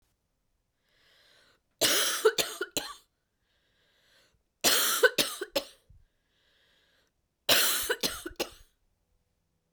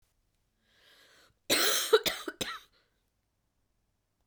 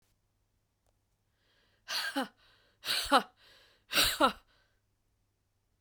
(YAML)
three_cough_length: 9.7 s
three_cough_amplitude: 12585
three_cough_signal_mean_std_ratio: 0.36
cough_length: 4.3 s
cough_amplitude: 10630
cough_signal_mean_std_ratio: 0.31
exhalation_length: 5.8 s
exhalation_amplitude: 11531
exhalation_signal_mean_std_ratio: 0.3
survey_phase: beta (2021-08-13 to 2022-03-07)
age: 18-44
gender: Female
wearing_mask: 'No'
symptom_cough_any: true
symptom_new_continuous_cough: true
symptom_runny_or_blocked_nose: true
symptom_onset: 3 days
smoker_status: Never smoked
respiratory_condition_asthma: true
respiratory_condition_other: false
recruitment_source: Test and Trace
submission_delay: 1 day
covid_test_result: Positive
covid_test_method: RT-qPCR
covid_ct_value: 17.9
covid_ct_gene: ORF1ab gene